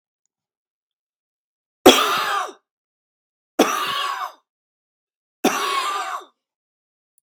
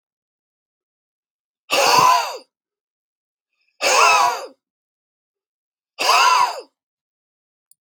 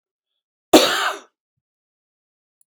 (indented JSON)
{
  "three_cough_length": "7.2 s",
  "three_cough_amplitude": 32768,
  "three_cough_signal_mean_std_ratio": 0.34,
  "exhalation_length": "7.8 s",
  "exhalation_amplitude": 29433,
  "exhalation_signal_mean_std_ratio": 0.39,
  "cough_length": "2.7 s",
  "cough_amplitude": 32768,
  "cough_signal_mean_std_ratio": 0.25,
  "survey_phase": "beta (2021-08-13 to 2022-03-07)",
  "age": "45-64",
  "gender": "Male",
  "wearing_mask": "No",
  "symptom_none": true,
  "smoker_status": "Never smoked",
  "respiratory_condition_asthma": false,
  "respiratory_condition_other": false,
  "recruitment_source": "Test and Trace",
  "submission_delay": "0 days",
  "covid_test_result": "Positive",
  "covid_test_method": "RT-qPCR",
  "covid_ct_value": 25.0,
  "covid_ct_gene": "ORF1ab gene"
}